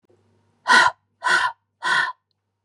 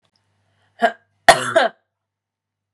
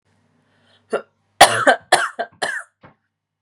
{"exhalation_length": "2.6 s", "exhalation_amplitude": 26900, "exhalation_signal_mean_std_ratio": 0.43, "cough_length": "2.7 s", "cough_amplitude": 32768, "cough_signal_mean_std_ratio": 0.27, "three_cough_length": "3.4 s", "three_cough_amplitude": 32768, "three_cough_signal_mean_std_ratio": 0.31, "survey_phase": "beta (2021-08-13 to 2022-03-07)", "age": "18-44", "gender": "Female", "wearing_mask": "No", "symptom_cough_any": true, "symptom_runny_or_blocked_nose": true, "symptom_sore_throat": true, "symptom_fatigue": true, "symptom_onset": "3 days", "smoker_status": "Never smoked", "respiratory_condition_asthma": false, "respiratory_condition_other": false, "recruitment_source": "Test and Trace", "submission_delay": "1 day", "covid_test_result": "Positive", "covid_test_method": "ePCR"}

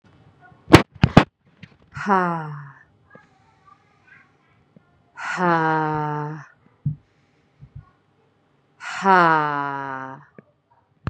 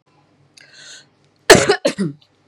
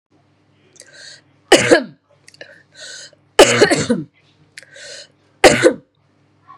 {"exhalation_length": "11.1 s", "exhalation_amplitude": 32768, "exhalation_signal_mean_std_ratio": 0.32, "cough_length": "2.5 s", "cough_amplitude": 32768, "cough_signal_mean_std_ratio": 0.3, "three_cough_length": "6.6 s", "three_cough_amplitude": 32768, "three_cough_signal_mean_std_ratio": 0.32, "survey_phase": "beta (2021-08-13 to 2022-03-07)", "age": "18-44", "gender": "Female", "wearing_mask": "No", "symptom_cough_any": true, "symptom_runny_or_blocked_nose": true, "symptom_fatigue": true, "symptom_fever_high_temperature": true, "symptom_headache": true, "symptom_change_to_sense_of_smell_or_taste": true, "symptom_onset": "4 days", "smoker_status": "Never smoked", "respiratory_condition_asthma": false, "respiratory_condition_other": false, "recruitment_source": "Test and Trace", "submission_delay": "2 days", "covid_test_result": "Positive", "covid_test_method": "RT-qPCR"}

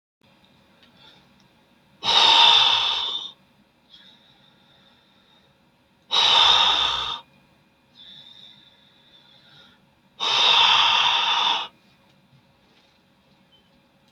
{"exhalation_length": "14.1 s", "exhalation_amplitude": 24116, "exhalation_signal_mean_std_ratio": 0.43, "survey_phase": "beta (2021-08-13 to 2022-03-07)", "age": "65+", "gender": "Male", "wearing_mask": "No", "symptom_none": true, "smoker_status": "Ex-smoker", "respiratory_condition_asthma": false, "respiratory_condition_other": false, "recruitment_source": "REACT", "submission_delay": "9 days", "covid_test_result": "Negative", "covid_test_method": "RT-qPCR", "influenza_a_test_result": "Negative", "influenza_b_test_result": "Negative"}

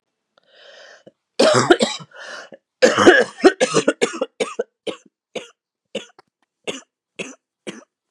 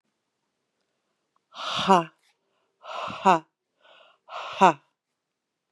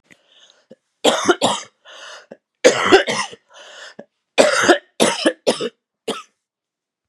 {"cough_length": "8.1 s", "cough_amplitude": 32768, "cough_signal_mean_std_ratio": 0.34, "exhalation_length": "5.7 s", "exhalation_amplitude": 24141, "exhalation_signal_mean_std_ratio": 0.25, "three_cough_length": "7.1 s", "three_cough_amplitude": 32768, "three_cough_signal_mean_std_ratio": 0.39, "survey_phase": "beta (2021-08-13 to 2022-03-07)", "age": "45-64", "gender": "Female", "wearing_mask": "No", "symptom_cough_any": true, "symptom_new_continuous_cough": true, "symptom_runny_or_blocked_nose": true, "symptom_fatigue": true, "symptom_headache": true, "symptom_change_to_sense_of_smell_or_taste": true, "symptom_loss_of_taste": true, "symptom_onset": "3 days", "smoker_status": "Ex-smoker", "respiratory_condition_asthma": false, "respiratory_condition_other": false, "recruitment_source": "Test and Trace", "submission_delay": "1 day", "covid_test_result": "Positive", "covid_test_method": "RT-qPCR"}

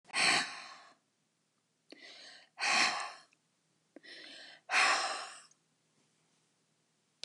{"exhalation_length": "7.2 s", "exhalation_amplitude": 6286, "exhalation_signal_mean_std_ratio": 0.38, "survey_phase": "beta (2021-08-13 to 2022-03-07)", "age": "65+", "gender": "Female", "wearing_mask": "No", "symptom_none": true, "symptom_onset": "12 days", "smoker_status": "Ex-smoker", "respiratory_condition_asthma": false, "respiratory_condition_other": false, "recruitment_source": "REACT", "submission_delay": "4 days", "covid_test_result": "Negative", "covid_test_method": "RT-qPCR", "influenza_a_test_result": "Negative", "influenza_b_test_result": "Negative"}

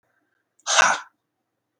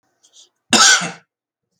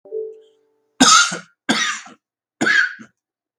{"exhalation_length": "1.8 s", "exhalation_amplitude": 26137, "exhalation_signal_mean_std_ratio": 0.31, "cough_length": "1.8 s", "cough_amplitude": 32768, "cough_signal_mean_std_ratio": 0.35, "three_cough_length": "3.6 s", "three_cough_amplitude": 32768, "three_cough_signal_mean_std_ratio": 0.42, "survey_phase": "beta (2021-08-13 to 2022-03-07)", "age": "18-44", "gender": "Male", "wearing_mask": "No", "symptom_cough_any": true, "symptom_runny_or_blocked_nose": true, "smoker_status": "Never smoked", "respiratory_condition_asthma": false, "respiratory_condition_other": false, "recruitment_source": "REACT", "submission_delay": "1 day", "covid_test_result": "Negative", "covid_test_method": "RT-qPCR"}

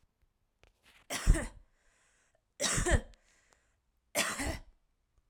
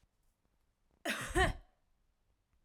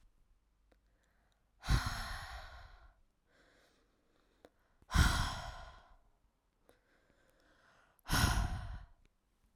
{"three_cough_length": "5.3 s", "three_cough_amplitude": 7707, "three_cough_signal_mean_std_ratio": 0.34, "cough_length": "2.6 s", "cough_amplitude": 3814, "cough_signal_mean_std_ratio": 0.31, "exhalation_length": "9.6 s", "exhalation_amplitude": 6255, "exhalation_signal_mean_std_ratio": 0.34, "survey_phase": "alpha (2021-03-01 to 2021-08-12)", "age": "18-44", "gender": "Female", "wearing_mask": "No", "symptom_none": true, "smoker_status": "Never smoked", "respiratory_condition_asthma": false, "respiratory_condition_other": false, "recruitment_source": "REACT", "submission_delay": "2 days", "covid_test_result": "Negative", "covid_test_method": "RT-qPCR"}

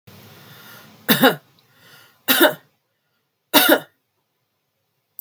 {"three_cough_length": "5.2 s", "three_cough_amplitude": 32768, "three_cough_signal_mean_std_ratio": 0.3, "survey_phase": "beta (2021-08-13 to 2022-03-07)", "age": "45-64", "gender": "Female", "wearing_mask": "No", "symptom_none": true, "smoker_status": "Never smoked", "respiratory_condition_asthma": false, "respiratory_condition_other": false, "recruitment_source": "REACT", "submission_delay": "3 days", "covid_test_result": "Negative", "covid_test_method": "RT-qPCR", "influenza_a_test_result": "Negative", "influenza_b_test_result": "Negative"}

